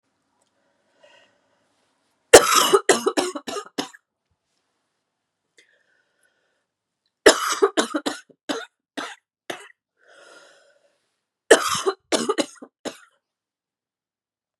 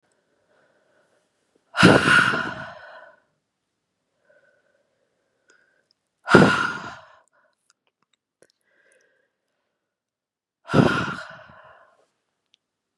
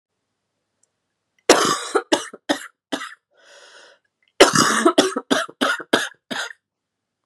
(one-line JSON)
{"three_cough_length": "14.6 s", "three_cough_amplitude": 32768, "three_cough_signal_mean_std_ratio": 0.25, "exhalation_length": "13.0 s", "exhalation_amplitude": 32737, "exhalation_signal_mean_std_ratio": 0.26, "cough_length": "7.3 s", "cough_amplitude": 32768, "cough_signal_mean_std_ratio": 0.37, "survey_phase": "beta (2021-08-13 to 2022-03-07)", "age": "18-44", "gender": "Female", "wearing_mask": "No", "symptom_cough_any": true, "symptom_new_continuous_cough": true, "symptom_runny_or_blocked_nose": true, "symptom_sore_throat": true, "symptom_headache": true, "symptom_onset": "6 days", "smoker_status": "Never smoked", "respiratory_condition_asthma": false, "respiratory_condition_other": false, "recruitment_source": "Test and Trace", "submission_delay": "5 days", "covid_test_result": "Positive", "covid_test_method": "RT-qPCR", "covid_ct_value": 22.7, "covid_ct_gene": "ORF1ab gene", "covid_ct_mean": 23.9, "covid_viral_load": "14000 copies/ml", "covid_viral_load_category": "Low viral load (10K-1M copies/ml)"}